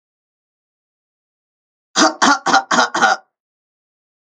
cough_length: 4.4 s
cough_amplitude: 32768
cough_signal_mean_std_ratio: 0.35
survey_phase: alpha (2021-03-01 to 2021-08-12)
age: 45-64
gender: Female
wearing_mask: 'No'
symptom_none: true
smoker_status: Ex-smoker
respiratory_condition_asthma: false
respiratory_condition_other: false
recruitment_source: REACT
submission_delay: 21 days
covid_test_result: Negative
covid_test_method: RT-qPCR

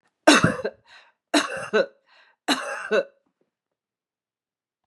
three_cough_length: 4.9 s
three_cough_amplitude: 32167
three_cough_signal_mean_std_ratio: 0.34
survey_phase: beta (2021-08-13 to 2022-03-07)
age: 45-64
gender: Female
wearing_mask: 'No'
symptom_none: true
symptom_onset: 3 days
smoker_status: Ex-smoker
respiratory_condition_asthma: false
respiratory_condition_other: false
recruitment_source: REACT
submission_delay: 2 days
covid_test_result: Negative
covid_test_method: RT-qPCR
influenza_a_test_result: Negative
influenza_b_test_result: Negative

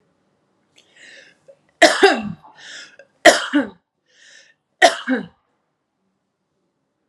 three_cough_length: 7.1 s
three_cough_amplitude: 32768
three_cough_signal_mean_std_ratio: 0.27
survey_phase: alpha (2021-03-01 to 2021-08-12)
age: 45-64
gender: Female
wearing_mask: 'Yes'
symptom_none: true
smoker_status: Ex-smoker
respiratory_condition_asthma: false
respiratory_condition_other: false
recruitment_source: Test and Trace
submission_delay: 0 days
covid_test_result: Negative
covid_test_method: LFT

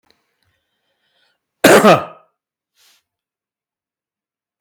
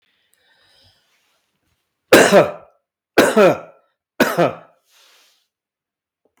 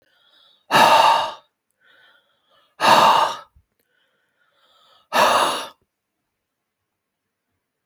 cough_length: 4.6 s
cough_amplitude: 32768
cough_signal_mean_std_ratio: 0.24
three_cough_length: 6.4 s
three_cough_amplitude: 32768
three_cough_signal_mean_std_ratio: 0.31
exhalation_length: 7.9 s
exhalation_amplitude: 29805
exhalation_signal_mean_std_ratio: 0.37
survey_phase: beta (2021-08-13 to 2022-03-07)
age: 45-64
gender: Male
wearing_mask: 'No'
symptom_none: true
smoker_status: Never smoked
respiratory_condition_asthma: false
respiratory_condition_other: false
recruitment_source: REACT
submission_delay: 5 days
covid_test_result: Negative
covid_test_method: RT-qPCR
influenza_a_test_result: Negative
influenza_b_test_result: Negative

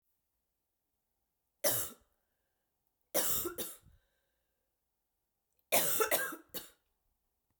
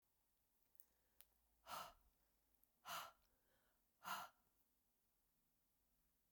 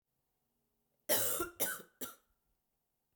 three_cough_length: 7.6 s
three_cough_amplitude: 6396
three_cough_signal_mean_std_ratio: 0.33
exhalation_length: 6.3 s
exhalation_amplitude: 556
exhalation_signal_mean_std_ratio: 0.32
cough_length: 3.2 s
cough_amplitude: 4386
cough_signal_mean_std_ratio: 0.35
survey_phase: beta (2021-08-13 to 2022-03-07)
age: 45-64
gender: Female
wearing_mask: 'No'
symptom_cough_any: true
symptom_runny_or_blocked_nose: true
symptom_sore_throat: true
symptom_fatigue: true
symptom_headache: true
symptom_onset: 3 days
smoker_status: Never smoked
respiratory_condition_asthma: false
respiratory_condition_other: false
recruitment_source: Test and Trace
submission_delay: 1 day
covid_test_result: Positive
covid_test_method: RT-qPCR
covid_ct_value: 18.7
covid_ct_gene: N gene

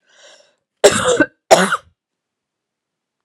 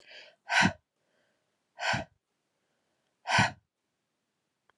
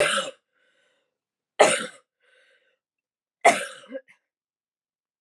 cough_length: 3.2 s
cough_amplitude: 32768
cough_signal_mean_std_ratio: 0.32
exhalation_length: 4.8 s
exhalation_amplitude: 9616
exhalation_signal_mean_std_ratio: 0.29
three_cough_length: 5.2 s
three_cough_amplitude: 27318
three_cough_signal_mean_std_ratio: 0.26
survey_phase: alpha (2021-03-01 to 2021-08-12)
age: 18-44
gender: Female
wearing_mask: 'No'
symptom_cough_any: true
symptom_change_to_sense_of_smell_or_taste: true
symptom_loss_of_taste: true
symptom_onset: 9 days
smoker_status: Ex-smoker
respiratory_condition_asthma: false
respiratory_condition_other: false
recruitment_source: Test and Trace
submission_delay: 2 days
covid_test_result: Positive
covid_test_method: RT-qPCR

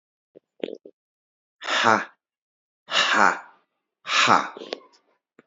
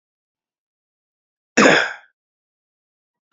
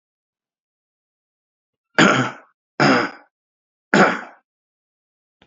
exhalation_length: 5.5 s
exhalation_amplitude: 28367
exhalation_signal_mean_std_ratio: 0.36
cough_length: 3.3 s
cough_amplitude: 28483
cough_signal_mean_std_ratio: 0.24
three_cough_length: 5.5 s
three_cough_amplitude: 27905
three_cough_signal_mean_std_ratio: 0.31
survey_phase: alpha (2021-03-01 to 2021-08-12)
age: 45-64
gender: Male
wearing_mask: 'No'
symptom_cough_any: true
symptom_shortness_of_breath: true
symptom_fatigue: true
symptom_headache: true
symptom_onset: 4 days
smoker_status: Never smoked
respiratory_condition_asthma: false
respiratory_condition_other: false
recruitment_source: Test and Trace
submission_delay: 2 days
covid_test_result: Positive
covid_test_method: RT-qPCR
covid_ct_value: 13.6
covid_ct_gene: ORF1ab gene
covid_ct_mean: 14.1
covid_viral_load: 24000000 copies/ml
covid_viral_load_category: High viral load (>1M copies/ml)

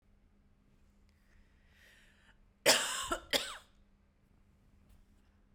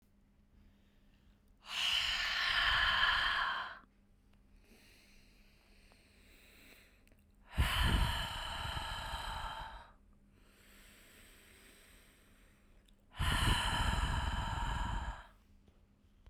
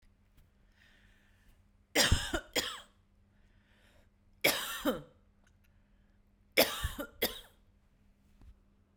cough_length: 5.5 s
cough_amplitude: 8825
cough_signal_mean_std_ratio: 0.27
exhalation_length: 16.3 s
exhalation_amplitude: 4014
exhalation_signal_mean_std_ratio: 0.54
three_cough_length: 9.0 s
three_cough_amplitude: 10056
three_cough_signal_mean_std_ratio: 0.31
survey_phase: beta (2021-08-13 to 2022-03-07)
age: 18-44
gender: Female
wearing_mask: 'No'
symptom_none: true
smoker_status: Never smoked
respiratory_condition_asthma: false
respiratory_condition_other: false
recruitment_source: REACT
submission_delay: 2 days
covid_test_result: Negative
covid_test_method: RT-qPCR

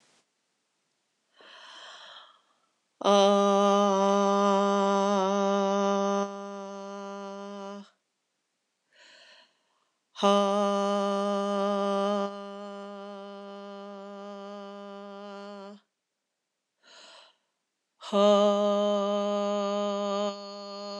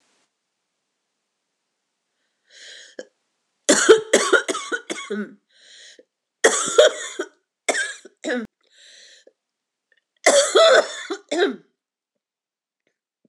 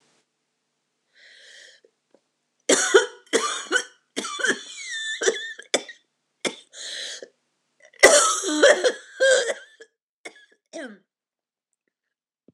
exhalation_length: 21.0 s
exhalation_amplitude: 10826
exhalation_signal_mean_std_ratio: 0.53
three_cough_length: 13.3 s
three_cough_amplitude: 26028
three_cough_signal_mean_std_ratio: 0.34
cough_length: 12.5 s
cough_amplitude: 26028
cough_signal_mean_std_ratio: 0.36
survey_phase: beta (2021-08-13 to 2022-03-07)
age: 45-64
gender: Female
wearing_mask: 'No'
symptom_cough_any: true
symptom_runny_or_blocked_nose: true
symptom_headache: true
symptom_onset: 3 days
smoker_status: Ex-smoker
respiratory_condition_asthma: false
respiratory_condition_other: false
recruitment_source: Test and Trace
submission_delay: 1 day
covid_test_result: Positive
covid_test_method: RT-qPCR
covid_ct_value: 15.3
covid_ct_gene: ORF1ab gene
covid_ct_mean: 15.8
covid_viral_load: 6400000 copies/ml
covid_viral_load_category: High viral load (>1M copies/ml)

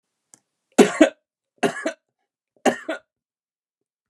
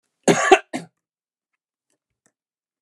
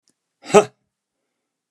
three_cough_length: 4.1 s
three_cough_amplitude: 32632
three_cough_signal_mean_std_ratio: 0.25
cough_length: 2.8 s
cough_amplitude: 32767
cough_signal_mean_std_ratio: 0.24
exhalation_length: 1.7 s
exhalation_amplitude: 32767
exhalation_signal_mean_std_ratio: 0.18
survey_phase: beta (2021-08-13 to 2022-03-07)
age: 65+
gender: Male
wearing_mask: 'No'
symptom_none: true
smoker_status: Ex-smoker
respiratory_condition_asthma: false
respiratory_condition_other: false
recruitment_source: REACT
submission_delay: 6 days
covid_test_result: Negative
covid_test_method: RT-qPCR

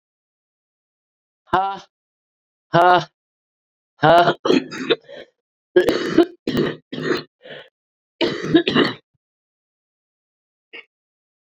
exhalation_length: 11.5 s
exhalation_amplitude: 30123
exhalation_signal_mean_std_ratio: 0.36
survey_phase: beta (2021-08-13 to 2022-03-07)
age: 45-64
gender: Female
wearing_mask: 'No'
symptom_cough_any: true
symptom_runny_or_blocked_nose: true
symptom_sore_throat: true
symptom_fatigue: true
symptom_fever_high_temperature: true
symptom_headache: true
symptom_change_to_sense_of_smell_or_taste: true
symptom_onset: 2 days
smoker_status: Ex-smoker
respiratory_condition_asthma: true
respiratory_condition_other: true
recruitment_source: Test and Trace
submission_delay: 2 days
covid_test_result: Positive
covid_test_method: RT-qPCR
covid_ct_value: 13.1
covid_ct_gene: ORF1ab gene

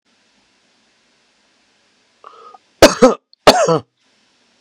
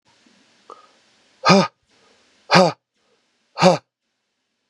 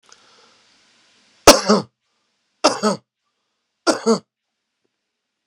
cough_length: 4.6 s
cough_amplitude: 32768
cough_signal_mean_std_ratio: 0.26
exhalation_length: 4.7 s
exhalation_amplitude: 32767
exhalation_signal_mean_std_ratio: 0.27
three_cough_length: 5.5 s
three_cough_amplitude: 32768
three_cough_signal_mean_std_ratio: 0.26
survey_phase: beta (2021-08-13 to 2022-03-07)
age: 45-64
gender: Male
wearing_mask: 'No'
symptom_cough_any: true
symptom_runny_or_blocked_nose: true
symptom_headache: true
smoker_status: Never smoked
respiratory_condition_asthma: false
respiratory_condition_other: false
recruitment_source: Test and Trace
submission_delay: 2 days
covid_test_result: Positive
covid_test_method: RT-qPCR
covid_ct_value: 18.2
covid_ct_gene: ORF1ab gene
covid_ct_mean: 18.6
covid_viral_load: 770000 copies/ml
covid_viral_load_category: Low viral load (10K-1M copies/ml)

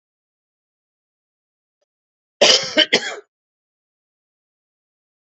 cough_length: 5.2 s
cough_amplitude: 32768
cough_signal_mean_std_ratio: 0.22
survey_phase: beta (2021-08-13 to 2022-03-07)
age: 45-64
gender: Male
wearing_mask: 'No'
symptom_cough_any: true
symptom_shortness_of_breath: true
symptom_other: true
symptom_onset: 8 days
smoker_status: Never smoked
respiratory_condition_asthma: true
respiratory_condition_other: false
recruitment_source: Test and Trace
submission_delay: 2 days
covid_test_result: Negative
covid_test_method: ePCR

